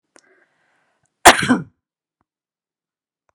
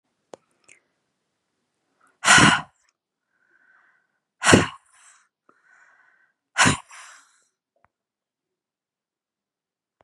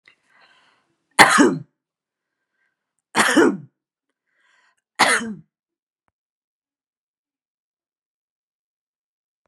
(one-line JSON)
{"cough_length": "3.3 s", "cough_amplitude": 32768, "cough_signal_mean_std_ratio": 0.2, "exhalation_length": "10.0 s", "exhalation_amplitude": 32500, "exhalation_signal_mean_std_ratio": 0.22, "three_cough_length": "9.5 s", "three_cough_amplitude": 32768, "three_cough_signal_mean_std_ratio": 0.25, "survey_phase": "beta (2021-08-13 to 2022-03-07)", "age": "65+", "gender": "Female", "wearing_mask": "No", "symptom_none": true, "symptom_onset": "2 days", "smoker_status": "Ex-smoker", "respiratory_condition_asthma": false, "respiratory_condition_other": false, "recruitment_source": "REACT", "submission_delay": "3 days", "covid_test_result": "Negative", "covid_test_method": "RT-qPCR", "influenza_a_test_result": "Negative", "influenza_b_test_result": "Negative"}